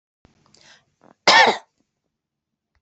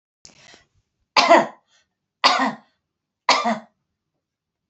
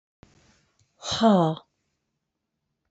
{"cough_length": "2.8 s", "cough_amplitude": 30865, "cough_signal_mean_std_ratio": 0.25, "three_cough_length": "4.7 s", "three_cough_amplitude": 30921, "three_cough_signal_mean_std_ratio": 0.32, "exhalation_length": "2.9 s", "exhalation_amplitude": 13843, "exhalation_signal_mean_std_ratio": 0.32, "survey_phase": "beta (2021-08-13 to 2022-03-07)", "age": "65+", "gender": "Female", "wearing_mask": "No", "symptom_none": true, "smoker_status": "Never smoked", "respiratory_condition_asthma": false, "respiratory_condition_other": false, "recruitment_source": "REACT", "submission_delay": "5 days", "covid_test_result": "Negative", "covid_test_method": "RT-qPCR", "influenza_a_test_result": "Negative", "influenza_b_test_result": "Negative"}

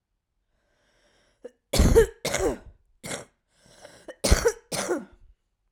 {"cough_length": "5.7 s", "cough_amplitude": 25299, "cough_signal_mean_std_ratio": 0.35, "survey_phase": "beta (2021-08-13 to 2022-03-07)", "age": "18-44", "gender": "Female", "wearing_mask": "No", "symptom_cough_any": true, "symptom_headache": true, "symptom_onset": "12 days", "smoker_status": "Current smoker (11 or more cigarettes per day)", "respiratory_condition_asthma": false, "respiratory_condition_other": false, "recruitment_source": "REACT", "submission_delay": "3 days", "covid_test_result": "Negative", "covid_test_method": "RT-qPCR", "influenza_a_test_result": "Negative", "influenza_b_test_result": "Negative"}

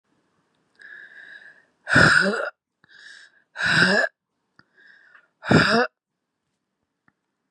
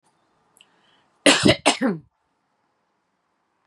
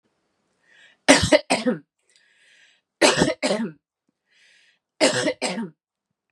{"exhalation_length": "7.5 s", "exhalation_amplitude": 26549, "exhalation_signal_mean_std_ratio": 0.36, "cough_length": "3.7 s", "cough_amplitude": 28757, "cough_signal_mean_std_ratio": 0.28, "three_cough_length": "6.3 s", "three_cough_amplitude": 32767, "three_cough_signal_mean_std_ratio": 0.36, "survey_phase": "beta (2021-08-13 to 2022-03-07)", "age": "18-44", "gender": "Female", "wearing_mask": "No", "symptom_cough_any": true, "symptom_runny_or_blocked_nose": true, "symptom_sore_throat": true, "symptom_onset": "3 days", "smoker_status": "Never smoked", "respiratory_condition_asthma": false, "respiratory_condition_other": false, "recruitment_source": "Test and Trace", "submission_delay": "1 day", "covid_test_result": "Positive", "covid_test_method": "RT-qPCR", "covid_ct_value": 25.8, "covid_ct_gene": "ORF1ab gene", "covid_ct_mean": 26.1, "covid_viral_load": "2800 copies/ml", "covid_viral_load_category": "Minimal viral load (< 10K copies/ml)"}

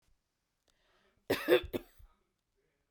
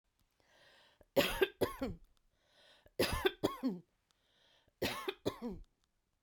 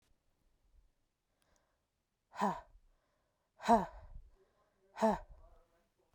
{"cough_length": "2.9 s", "cough_amplitude": 6800, "cough_signal_mean_std_ratio": 0.24, "three_cough_length": "6.2 s", "three_cough_amplitude": 5297, "three_cough_signal_mean_std_ratio": 0.37, "exhalation_length": "6.1 s", "exhalation_amplitude": 5650, "exhalation_signal_mean_std_ratio": 0.25, "survey_phase": "beta (2021-08-13 to 2022-03-07)", "age": "45-64", "gender": "Female", "wearing_mask": "No", "symptom_headache": true, "smoker_status": "Never smoked", "respiratory_condition_asthma": false, "respiratory_condition_other": false, "recruitment_source": "REACT", "submission_delay": "1 day", "covid_test_result": "Negative", "covid_test_method": "RT-qPCR"}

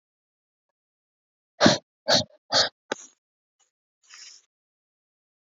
{"exhalation_length": "5.5 s", "exhalation_amplitude": 26457, "exhalation_signal_mean_std_ratio": 0.23, "survey_phase": "beta (2021-08-13 to 2022-03-07)", "age": "18-44", "gender": "Female", "wearing_mask": "No", "symptom_cough_any": true, "symptom_runny_or_blocked_nose": true, "symptom_shortness_of_breath": true, "symptom_sore_throat": true, "symptom_fatigue": true, "symptom_fever_high_temperature": true, "symptom_headache": true, "symptom_onset": "2 days", "smoker_status": "Never smoked", "respiratory_condition_asthma": false, "respiratory_condition_other": false, "recruitment_source": "Test and Trace", "submission_delay": "2 days", "covid_test_result": "Positive", "covid_test_method": "RT-qPCR", "covid_ct_value": 25.8, "covid_ct_gene": "ORF1ab gene", "covid_ct_mean": 26.2, "covid_viral_load": "2500 copies/ml", "covid_viral_load_category": "Minimal viral load (< 10K copies/ml)"}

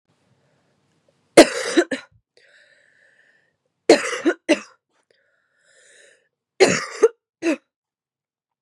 {"three_cough_length": "8.6 s", "three_cough_amplitude": 32768, "three_cough_signal_mean_std_ratio": 0.25, "survey_phase": "beta (2021-08-13 to 2022-03-07)", "age": "18-44", "gender": "Female", "wearing_mask": "No", "symptom_cough_any": true, "symptom_runny_or_blocked_nose": true, "symptom_sore_throat": true, "symptom_fatigue": true, "symptom_headache": true, "symptom_other": true, "symptom_onset": "4 days", "smoker_status": "Prefer not to say", "respiratory_condition_asthma": false, "respiratory_condition_other": false, "recruitment_source": "Test and Trace", "submission_delay": "2 days", "covid_test_result": "Positive", "covid_test_method": "RT-qPCR"}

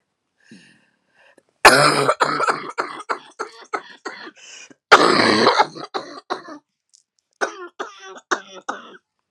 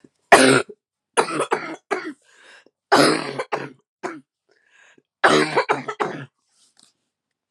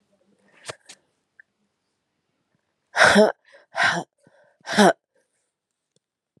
{"cough_length": "9.3 s", "cough_amplitude": 32768, "cough_signal_mean_std_ratio": 0.37, "three_cough_length": "7.5 s", "three_cough_amplitude": 32768, "three_cough_signal_mean_std_ratio": 0.37, "exhalation_length": "6.4 s", "exhalation_amplitude": 29443, "exhalation_signal_mean_std_ratio": 0.27, "survey_phase": "beta (2021-08-13 to 2022-03-07)", "age": "45-64", "gender": "Female", "wearing_mask": "No", "symptom_cough_any": true, "symptom_runny_or_blocked_nose": true, "symptom_shortness_of_breath": true, "symptom_sore_throat": true, "symptom_fatigue": true, "symptom_fever_high_temperature": true, "symptom_headache": true, "symptom_change_to_sense_of_smell_or_taste": true, "symptom_loss_of_taste": true, "symptom_onset": "5 days", "smoker_status": "Ex-smoker", "respiratory_condition_asthma": false, "respiratory_condition_other": false, "recruitment_source": "Test and Trace", "submission_delay": "2 days", "covid_test_result": "Positive", "covid_test_method": "RT-qPCR", "covid_ct_value": 14.9, "covid_ct_gene": "ORF1ab gene", "covid_ct_mean": 15.1, "covid_viral_load": "11000000 copies/ml", "covid_viral_load_category": "High viral load (>1M copies/ml)"}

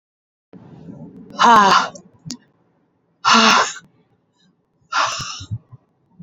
{"exhalation_length": "6.2 s", "exhalation_amplitude": 32767, "exhalation_signal_mean_std_ratio": 0.38, "survey_phase": "beta (2021-08-13 to 2022-03-07)", "age": "18-44", "gender": "Female", "wearing_mask": "No", "symptom_cough_any": true, "symptom_runny_or_blocked_nose": true, "symptom_onset": "3 days", "smoker_status": "Never smoked", "respiratory_condition_asthma": false, "respiratory_condition_other": false, "recruitment_source": "REACT", "submission_delay": "2 days", "covid_test_result": "Negative", "covid_test_method": "RT-qPCR", "influenza_a_test_result": "Negative", "influenza_b_test_result": "Negative"}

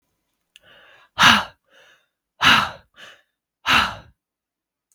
{"exhalation_length": "4.9 s", "exhalation_amplitude": 32768, "exhalation_signal_mean_std_ratio": 0.31, "survey_phase": "beta (2021-08-13 to 2022-03-07)", "age": "18-44", "gender": "Female", "wearing_mask": "No", "symptom_none": true, "smoker_status": "Ex-smoker", "respiratory_condition_asthma": false, "respiratory_condition_other": false, "recruitment_source": "REACT", "submission_delay": "1 day", "covid_test_result": "Negative", "covid_test_method": "RT-qPCR"}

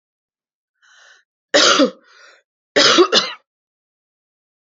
{"three_cough_length": "4.6 s", "three_cough_amplitude": 32489, "three_cough_signal_mean_std_ratio": 0.35, "survey_phase": "beta (2021-08-13 to 2022-03-07)", "age": "18-44", "gender": "Female", "wearing_mask": "No", "symptom_sore_throat": true, "symptom_fatigue": true, "symptom_headache": true, "symptom_onset": "5 days", "smoker_status": "Ex-smoker", "respiratory_condition_asthma": false, "respiratory_condition_other": false, "recruitment_source": "Test and Trace", "submission_delay": "1 day", "covid_test_result": "Positive", "covid_test_method": "RT-qPCR", "covid_ct_value": 32.9, "covid_ct_gene": "N gene"}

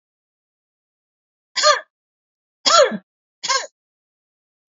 {"three_cough_length": "4.7 s", "three_cough_amplitude": 28646, "three_cough_signal_mean_std_ratio": 0.28, "survey_phase": "beta (2021-08-13 to 2022-03-07)", "age": "65+", "gender": "Female", "wearing_mask": "No", "symptom_none": true, "smoker_status": "Never smoked", "respiratory_condition_asthma": false, "respiratory_condition_other": false, "recruitment_source": "REACT", "submission_delay": "1 day", "covid_test_result": "Negative", "covid_test_method": "RT-qPCR", "influenza_a_test_result": "Unknown/Void", "influenza_b_test_result": "Unknown/Void"}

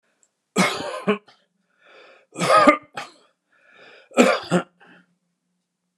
{"three_cough_length": "6.0 s", "three_cough_amplitude": 32767, "three_cough_signal_mean_std_ratio": 0.34, "survey_phase": "beta (2021-08-13 to 2022-03-07)", "age": "65+", "gender": "Male", "wearing_mask": "No", "symptom_none": true, "smoker_status": "Ex-smoker", "respiratory_condition_asthma": false, "respiratory_condition_other": false, "recruitment_source": "REACT", "submission_delay": "1 day", "covid_test_result": "Negative", "covid_test_method": "RT-qPCR"}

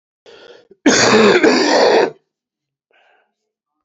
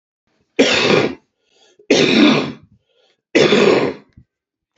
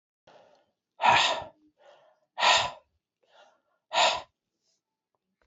{"cough_length": "3.8 s", "cough_amplitude": 29503, "cough_signal_mean_std_ratio": 0.51, "three_cough_length": "4.8 s", "three_cough_amplitude": 29303, "three_cough_signal_mean_std_ratio": 0.51, "exhalation_length": "5.5 s", "exhalation_amplitude": 14643, "exhalation_signal_mean_std_ratio": 0.33, "survey_phase": "beta (2021-08-13 to 2022-03-07)", "age": "65+", "gender": "Male", "wearing_mask": "No", "symptom_cough_any": true, "symptom_runny_or_blocked_nose": true, "symptom_sore_throat": true, "symptom_headache": true, "symptom_change_to_sense_of_smell_or_taste": true, "symptom_onset": "4 days", "smoker_status": "Ex-smoker", "respiratory_condition_asthma": false, "respiratory_condition_other": false, "recruitment_source": "Test and Trace", "submission_delay": "2 days", "covid_test_result": "Positive", "covid_test_method": "RT-qPCR", "covid_ct_value": 21.9, "covid_ct_gene": "ORF1ab gene", "covid_ct_mean": 23.7, "covid_viral_load": "17000 copies/ml", "covid_viral_load_category": "Low viral load (10K-1M copies/ml)"}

